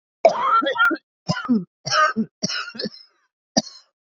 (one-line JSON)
{"cough_length": "4.0 s", "cough_amplitude": 27249, "cough_signal_mean_std_ratio": 0.53, "survey_phase": "beta (2021-08-13 to 2022-03-07)", "age": "18-44", "gender": "Female", "wearing_mask": "No", "symptom_cough_any": true, "symptom_sore_throat": true, "symptom_onset": "5 days", "smoker_status": "Current smoker (11 or more cigarettes per day)", "respiratory_condition_asthma": false, "respiratory_condition_other": false, "recruitment_source": "REACT", "submission_delay": "4 days", "covid_test_result": "Negative", "covid_test_method": "RT-qPCR", "influenza_a_test_result": "Negative", "influenza_b_test_result": "Negative"}